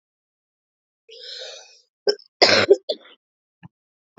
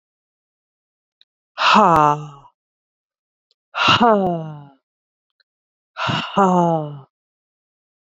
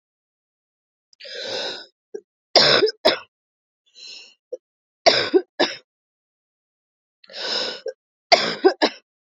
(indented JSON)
{
  "cough_length": "4.2 s",
  "cough_amplitude": 32278,
  "cough_signal_mean_std_ratio": 0.26,
  "exhalation_length": "8.2 s",
  "exhalation_amplitude": 29581,
  "exhalation_signal_mean_std_ratio": 0.38,
  "three_cough_length": "9.4 s",
  "three_cough_amplitude": 32262,
  "three_cough_signal_mean_std_ratio": 0.33,
  "survey_phase": "beta (2021-08-13 to 2022-03-07)",
  "age": "18-44",
  "gender": "Female",
  "wearing_mask": "No",
  "symptom_cough_any": true,
  "symptom_sore_throat": true,
  "symptom_headache": true,
  "symptom_onset": "4 days",
  "smoker_status": "Never smoked",
  "respiratory_condition_asthma": false,
  "respiratory_condition_other": false,
  "recruitment_source": "Test and Trace",
  "submission_delay": "1 day",
  "covid_test_result": "Positive",
  "covid_test_method": "RT-qPCR",
  "covid_ct_value": 18.7,
  "covid_ct_gene": "ORF1ab gene",
  "covid_ct_mean": 19.5,
  "covid_viral_load": "410000 copies/ml",
  "covid_viral_load_category": "Low viral load (10K-1M copies/ml)"
}